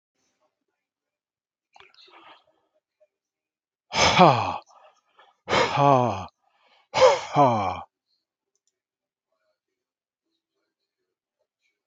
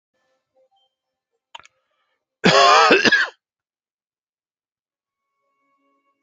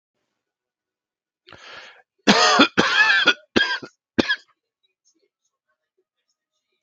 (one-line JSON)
{"exhalation_length": "11.9 s", "exhalation_amplitude": 26675, "exhalation_signal_mean_std_ratio": 0.3, "cough_length": "6.2 s", "cough_amplitude": 28893, "cough_signal_mean_std_ratio": 0.29, "three_cough_length": "6.8 s", "three_cough_amplitude": 30455, "three_cough_signal_mean_std_ratio": 0.34, "survey_phase": "beta (2021-08-13 to 2022-03-07)", "age": "45-64", "gender": "Male", "wearing_mask": "No", "symptom_fatigue": true, "symptom_headache": true, "smoker_status": "Never smoked", "respiratory_condition_asthma": false, "respiratory_condition_other": false, "recruitment_source": "REACT", "submission_delay": "3 days", "covid_test_result": "Negative", "covid_test_method": "RT-qPCR"}